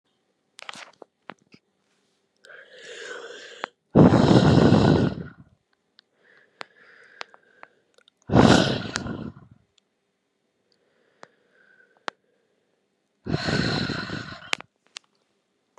{
  "exhalation_length": "15.8 s",
  "exhalation_amplitude": 32042,
  "exhalation_signal_mean_std_ratio": 0.31,
  "survey_phase": "beta (2021-08-13 to 2022-03-07)",
  "age": "18-44",
  "gender": "Female",
  "wearing_mask": "No",
  "symptom_cough_any": true,
  "symptom_runny_or_blocked_nose": true,
  "symptom_shortness_of_breath": true,
  "symptom_sore_throat": true,
  "smoker_status": "Prefer not to say",
  "respiratory_condition_asthma": false,
  "respiratory_condition_other": false,
  "recruitment_source": "Test and Trace",
  "submission_delay": "2 days",
  "covid_test_result": "Positive",
  "covid_test_method": "RT-qPCR",
  "covid_ct_value": 25.8,
  "covid_ct_gene": "ORF1ab gene"
}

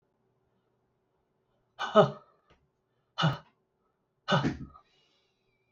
{
  "exhalation_length": "5.7 s",
  "exhalation_amplitude": 14376,
  "exhalation_signal_mean_std_ratio": 0.25,
  "survey_phase": "alpha (2021-03-01 to 2021-08-12)",
  "age": "45-64",
  "gender": "Male",
  "wearing_mask": "No",
  "symptom_fatigue": true,
  "smoker_status": "Ex-smoker",
  "respiratory_condition_asthma": false,
  "respiratory_condition_other": false,
  "recruitment_source": "REACT",
  "submission_delay": "2 days",
  "covid_test_result": "Negative",
  "covid_test_method": "RT-qPCR"
}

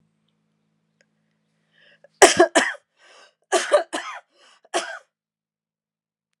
{
  "cough_length": "6.4 s",
  "cough_amplitude": 32768,
  "cough_signal_mean_std_ratio": 0.25,
  "survey_phase": "alpha (2021-03-01 to 2021-08-12)",
  "age": "45-64",
  "gender": "Female",
  "wearing_mask": "No",
  "symptom_cough_any": true,
  "symptom_fatigue": true,
  "smoker_status": "Never smoked",
  "respiratory_condition_asthma": false,
  "respiratory_condition_other": false,
  "recruitment_source": "Test and Trace",
  "submission_delay": "2 days",
  "covid_ct_value": 22.9,
  "covid_ct_gene": "ORF1ab gene"
}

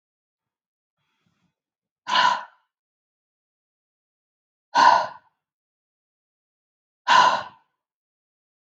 {
  "exhalation_length": "8.6 s",
  "exhalation_amplitude": 26425,
  "exhalation_signal_mean_std_ratio": 0.26,
  "survey_phase": "beta (2021-08-13 to 2022-03-07)",
  "age": "18-44",
  "gender": "Female",
  "wearing_mask": "No",
  "symptom_cough_any": true,
  "symptom_runny_or_blocked_nose": true,
  "symptom_onset": "12 days",
  "smoker_status": "Never smoked",
  "respiratory_condition_asthma": false,
  "respiratory_condition_other": false,
  "recruitment_source": "REACT",
  "submission_delay": "1 day",
  "covid_test_result": "Negative",
  "covid_test_method": "RT-qPCR",
  "influenza_a_test_result": "Negative",
  "influenza_b_test_result": "Negative"
}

